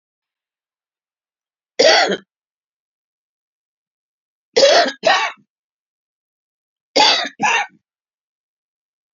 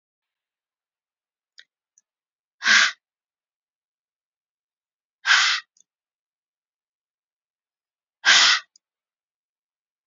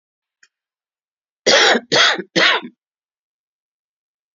{"three_cough_length": "9.1 s", "three_cough_amplitude": 32767, "three_cough_signal_mean_std_ratio": 0.32, "exhalation_length": "10.1 s", "exhalation_amplitude": 27222, "exhalation_signal_mean_std_ratio": 0.24, "cough_length": "4.4 s", "cough_amplitude": 30762, "cough_signal_mean_std_ratio": 0.36, "survey_phase": "beta (2021-08-13 to 2022-03-07)", "age": "45-64", "gender": "Female", "wearing_mask": "No", "symptom_cough_any": true, "symptom_new_continuous_cough": true, "symptom_runny_or_blocked_nose": true, "symptom_sore_throat": true, "symptom_headache": true, "symptom_change_to_sense_of_smell_or_taste": true, "symptom_loss_of_taste": true, "symptom_other": true, "symptom_onset": "5 days", "smoker_status": "Never smoked", "respiratory_condition_asthma": false, "respiratory_condition_other": false, "recruitment_source": "Test and Trace", "submission_delay": "2 days", "covid_test_result": "Positive", "covid_test_method": "RT-qPCR", "covid_ct_value": 20.8, "covid_ct_gene": "ORF1ab gene", "covid_ct_mean": 21.8, "covid_viral_load": "73000 copies/ml", "covid_viral_load_category": "Low viral load (10K-1M copies/ml)"}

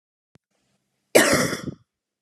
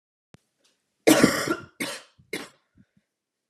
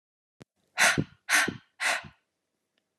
{"cough_length": "2.2 s", "cough_amplitude": 30854, "cough_signal_mean_std_ratio": 0.33, "three_cough_length": "3.5 s", "three_cough_amplitude": 27116, "three_cough_signal_mean_std_ratio": 0.3, "exhalation_length": "3.0 s", "exhalation_amplitude": 12973, "exhalation_signal_mean_std_ratio": 0.37, "survey_phase": "beta (2021-08-13 to 2022-03-07)", "age": "18-44", "gender": "Female", "wearing_mask": "No", "symptom_cough_any": true, "symptom_runny_or_blocked_nose": true, "symptom_fatigue": true, "symptom_headache": true, "symptom_other": true, "symptom_onset": "3 days", "smoker_status": "Ex-smoker", "respiratory_condition_asthma": false, "respiratory_condition_other": false, "recruitment_source": "Test and Trace", "submission_delay": "2 days", "covid_test_result": "Positive", "covid_test_method": "RT-qPCR"}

